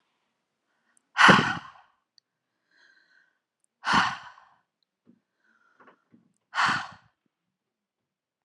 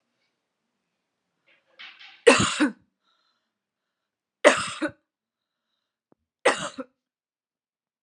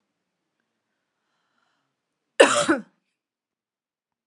{"exhalation_length": "8.4 s", "exhalation_amplitude": 24311, "exhalation_signal_mean_std_ratio": 0.24, "three_cough_length": "8.0 s", "three_cough_amplitude": 32146, "three_cough_signal_mean_std_ratio": 0.23, "cough_length": "4.3 s", "cough_amplitude": 32690, "cough_signal_mean_std_ratio": 0.2, "survey_phase": "alpha (2021-03-01 to 2021-08-12)", "age": "45-64", "gender": "Female", "wearing_mask": "No", "symptom_none": true, "smoker_status": "Never smoked", "respiratory_condition_asthma": false, "respiratory_condition_other": false, "recruitment_source": "REACT", "submission_delay": "1 day", "covid_test_result": "Negative", "covid_test_method": "RT-qPCR"}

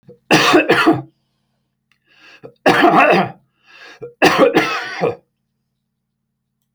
{"three_cough_length": "6.7 s", "three_cough_amplitude": 32768, "three_cough_signal_mean_std_ratio": 0.46, "survey_phase": "alpha (2021-03-01 to 2021-08-12)", "age": "45-64", "gender": "Male", "wearing_mask": "No", "symptom_cough_any": true, "smoker_status": "Ex-smoker", "respiratory_condition_asthma": false, "respiratory_condition_other": false, "recruitment_source": "REACT", "submission_delay": "1 day", "covid_test_result": "Negative", "covid_test_method": "RT-qPCR"}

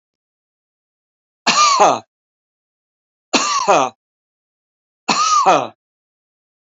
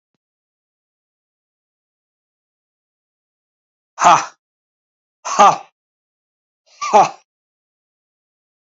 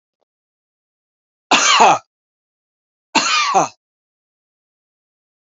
{"three_cough_length": "6.7 s", "three_cough_amplitude": 30758, "three_cough_signal_mean_std_ratio": 0.39, "exhalation_length": "8.8 s", "exhalation_amplitude": 30253, "exhalation_signal_mean_std_ratio": 0.21, "cough_length": "5.5 s", "cough_amplitude": 28059, "cough_signal_mean_std_ratio": 0.33, "survey_phase": "alpha (2021-03-01 to 2021-08-12)", "age": "65+", "gender": "Male", "wearing_mask": "No", "symptom_none": true, "smoker_status": "Ex-smoker", "respiratory_condition_asthma": false, "respiratory_condition_other": false, "recruitment_source": "REACT", "submission_delay": "1 day", "covid_test_result": "Negative", "covid_test_method": "RT-qPCR"}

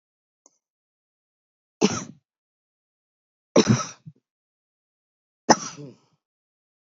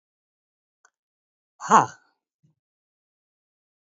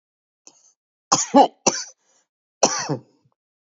{"three_cough_length": "6.9 s", "three_cough_amplitude": 28962, "three_cough_signal_mean_std_ratio": 0.2, "exhalation_length": "3.8 s", "exhalation_amplitude": 27970, "exhalation_signal_mean_std_ratio": 0.15, "cough_length": "3.7 s", "cough_amplitude": 32767, "cough_signal_mean_std_ratio": 0.29, "survey_phase": "beta (2021-08-13 to 2022-03-07)", "age": "45-64", "gender": "Female", "wearing_mask": "No", "symptom_sore_throat": true, "symptom_fatigue": true, "symptom_headache": true, "symptom_onset": "12 days", "smoker_status": "Current smoker (11 or more cigarettes per day)", "respiratory_condition_asthma": false, "respiratory_condition_other": false, "recruitment_source": "REACT", "submission_delay": "1 day", "covid_test_result": "Negative", "covid_test_method": "RT-qPCR", "influenza_a_test_result": "Negative", "influenza_b_test_result": "Negative"}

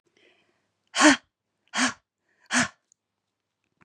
{"exhalation_length": "3.8 s", "exhalation_amplitude": 21326, "exhalation_signal_mean_std_ratio": 0.27, "survey_phase": "beta (2021-08-13 to 2022-03-07)", "age": "45-64", "gender": "Female", "wearing_mask": "No", "symptom_none": true, "smoker_status": "Never smoked", "respiratory_condition_asthma": false, "respiratory_condition_other": false, "recruitment_source": "REACT", "submission_delay": "2 days", "covid_test_result": "Negative", "covid_test_method": "RT-qPCR", "influenza_a_test_result": "Negative", "influenza_b_test_result": "Negative"}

